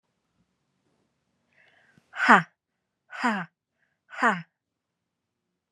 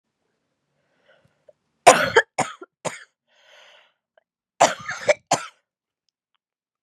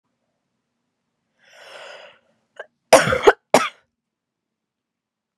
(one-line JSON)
{"exhalation_length": "5.7 s", "exhalation_amplitude": 29168, "exhalation_signal_mean_std_ratio": 0.23, "three_cough_length": "6.8 s", "three_cough_amplitude": 32768, "three_cough_signal_mean_std_ratio": 0.23, "cough_length": "5.4 s", "cough_amplitude": 32768, "cough_signal_mean_std_ratio": 0.21, "survey_phase": "beta (2021-08-13 to 2022-03-07)", "age": "45-64", "gender": "Female", "wearing_mask": "No", "symptom_cough_any": true, "symptom_runny_or_blocked_nose": true, "symptom_fatigue": true, "symptom_fever_high_temperature": true, "smoker_status": "Never smoked", "respiratory_condition_asthma": false, "respiratory_condition_other": false, "recruitment_source": "Test and Trace", "submission_delay": "2 days", "covid_test_result": "Positive", "covid_test_method": "ePCR"}